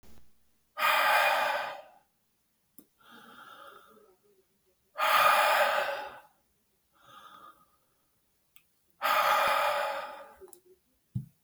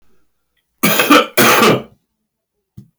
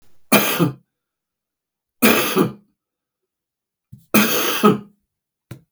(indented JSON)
{
  "exhalation_length": "11.4 s",
  "exhalation_amplitude": 8472,
  "exhalation_signal_mean_std_ratio": 0.46,
  "cough_length": "3.0 s",
  "cough_amplitude": 32768,
  "cough_signal_mean_std_ratio": 0.46,
  "three_cough_length": "5.7 s",
  "three_cough_amplitude": 32768,
  "three_cough_signal_mean_std_ratio": 0.4,
  "survey_phase": "beta (2021-08-13 to 2022-03-07)",
  "age": "65+",
  "gender": "Male",
  "wearing_mask": "No",
  "symptom_none": true,
  "smoker_status": "Never smoked",
  "respiratory_condition_asthma": true,
  "respiratory_condition_other": false,
  "recruitment_source": "Test and Trace",
  "submission_delay": "1 day",
  "covid_test_result": "Positive",
  "covid_test_method": "RT-qPCR",
  "covid_ct_value": 29.2,
  "covid_ct_gene": "N gene"
}